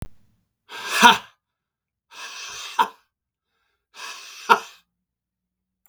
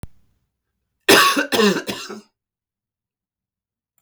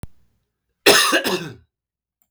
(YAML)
exhalation_length: 5.9 s
exhalation_amplitude: 32768
exhalation_signal_mean_std_ratio: 0.24
three_cough_length: 4.0 s
three_cough_amplitude: 32768
three_cough_signal_mean_std_ratio: 0.34
cough_length: 2.3 s
cough_amplitude: 32768
cough_signal_mean_std_ratio: 0.38
survey_phase: beta (2021-08-13 to 2022-03-07)
age: 45-64
gender: Male
wearing_mask: 'No'
symptom_none: true
smoker_status: Never smoked
respiratory_condition_asthma: false
respiratory_condition_other: false
recruitment_source: REACT
submission_delay: 4 days
covid_test_result: Negative
covid_test_method: RT-qPCR
influenza_a_test_result: Negative
influenza_b_test_result: Negative